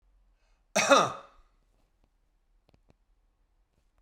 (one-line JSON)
{"cough_length": "4.0 s", "cough_amplitude": 14394, "cough_signal_mean_std_ratio": 0.23, "survey_phase": "beta (2021-08-13 to 2022-03-07)", "age": "45-64", "gender": "Male", "wearing_mask": "No", "symptom_none": true, "smoker_status": "Ex-smoker", "respiratory_condition_asthma": false, "respiratory_condition_other": false, "recruitment_source": "REACT", "submission_delay": "3 days", "covid_test_result": "Negative", "covid_test_method": "RT-qPCR", "influenza_a_test_result": "Negative", "influenza_b_test_result": "Negative"}